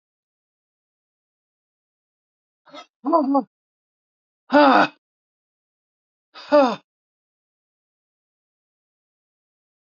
{"exhalation_length": "9.9 s", "exhalation_amplitude": 25045, "exhalation_signal_mean_std_ratio": 0.24, "survey_phase": "alpha (2021-03-01 to 2021-08-12)", "age": "65+", "gender": "Female", "wearing_mask": "No", "symptom_none": true, "smoker_status": "Ex-smoker", "respiratory_condition_asthma": true, "respiratory_condition_other": false, "recruitment_source": "REACT", "submission_delay": "2 days", "covid_test_result": "Negative", "covid_test_method": "RT-qPCR"}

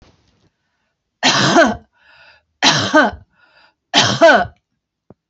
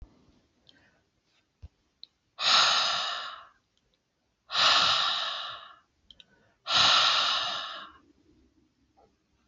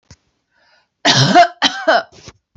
{"three_cough_length": "5.3 s", "three_cough_amplitude": 31178, "three_cough_signal_mean_std_ratio": 0.42, "exhalation_length": "9.5 s", "exhalation_amplitude": 10971, "exhalation_signal_mean_std_ratio": 0.45, "cough_length": "2.6 s", "cough_amplitude": 30360, "cough_signal_mean_std_ratio": 0.44, "survey_phase": "beta (2021-08-13 to 2022-03-07)", "age": "45-64", "gender": "Female", "wearing_mask": "No", "symptom_runny_or_blocked_nose": true, "symptom_sore_throat": true, "smoker_status": "Never smoked", "respiratory_condition_asthma": false, "respiratory_condition_other": true, "recruitment_source": "REACT", "submission_delay": "0 days", "covid_test_result": "Negative", "covid_test_method": "RT-qPCR"}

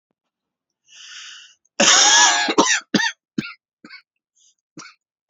{"cough_length": "5.3 s", "cough_amplitude": 31549, "cough_signal_mean_std_ratio": 0.39, "survey_phase": "beta (2021-08-13 to 2022-03-07)", "age": "18-44", "gender": "Male", "wearing_mask": "No", "symptom_runny_or_blocked_nose": true, "symptom_onset": "13 days", "smoker_status": "Never smoked", "respiratory_condition_asthma": true, "respiratory_condition_other": false, "recruitment_source": "REACT", "submission_delay": "6 days", "covid_test_result": "Negative", "covid_test_method": "RT-qPCR", "influenza_a_test_result": "Negative", "influenza_b_test_result": "Negative"}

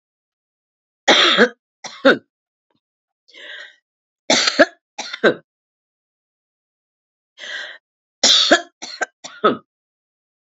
{"three_cough_length": "10.6 s", "three_cough_amplitude": 31198, "three_cough_signal_mean_std_ratio": 0.31, "survey_phase": "alpha (2021-03-01 to 2021-08-12)", "age": "65+", "gender": "Female", "wearing_mask": "No", "symptom_cough_any": true, "symptom_fatigue": true, "symptom_headache": true, "symptom_change_to_sense_of_smell_or_taste": true, "symptom_loss_of_taste": true, "smoker_status": "Never smoked", "respiratory_condition_asthma": false, "respiratory_condition_other": false, "recruitment_source": "Test and Trace", "submission_delay": "2 days", "covid_test_result": "Positive", "covid_test_method": "LFT"}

